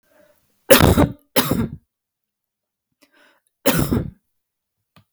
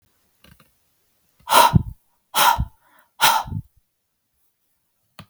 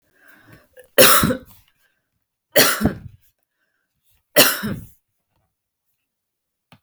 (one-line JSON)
{"cough_length": "5.1 s", "cough_amplitude": 32768, "cough_signal_mean_std_ratio": 0.33, "exhalation_length": "5.3 s", "exhalation_amplitude": 32767, "exhalation_signal_mean_std_ratio": 0.31, "three_cough_length": "6.8 s", "three_cough_amplitude": 32768, "three_cough_signal_mean_std_ratio": 0.29, "survey_phase": "beta (2021-08-13 to 2022-03-07)", "age": "18-44", "gender": "Female", "wearing_mask": "No", "symptom_cough_any": true, "symptom_runny_or_blocked_nose": true, "smoker_status": "Ex-smoker", "respiratory_condition_asthma": false, "respiratory_condition_other": false, "recruitment_source": "REACT", "submission_delay": "1 day", "covid_test_result": "Negative", "covid_test_method": "RT-qPCR"}